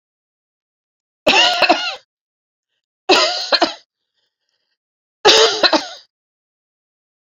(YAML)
three_cough_length: 7.3 s
three_cough_amplitude: 32768
three_cough_signal_mean_std_ratio: 0.37
survey_phase: beta (2021-08-13 to 2022-03-07)
age: 45-64
gender: Female
wearing_mask: 'No'
symptom_cough_any: true
symptom_runny_or_blocked_nose: true
symptom_fatigue: true
symptom_change_to_sense_of_smell_or_taste: true
symptom_onset: 5 days
smoker_status: Ex-smoker
respiratory_condition_asthma: false
respiratory_condition_other: false
recruitment_source: Test and Trace
submission_delay: 2 days
covid_test_result: Positive
covid_test_method: RT-qPCR
covid_ct_value: 15.1
covid_ct_gene: ORF1ab gene
covid_ct_mean: 15.4
covid_viral_load: 8900000 copies/ml
covid_viral_load_category: High viral load (>1M copies/ml)